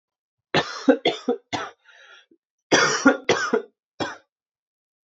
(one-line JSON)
{"cough_length": "5.0 s", "cough_amplitude": 26409, "cough_signal_mean_std_ratio": 0.39, "survey_phase": "beta (2021-08-13 to 2022-03-07)", "age": "18-44", "gender": "Male", "wearing_mask": "No", "symptom_cough_any": true, "symptom_new_continuous_cough": true, "symptom_runny_or_blocked_nose": true, "symptom_shortness_of_breath": true, "symptom_sore_throat": true, "symptom_fever_high_temperature": true, "symptom_headache": true, "symptom_onset": "4 days", "smoker_status": "Never smoked", "respiratory_condition_asthma": false, "respiratory_condition_other": false, "recruitment_source": "Test and Trace", "submission_delay": "2 days", "covid_test_result": "Positive", "covid_test_method": "RT-qPCR"}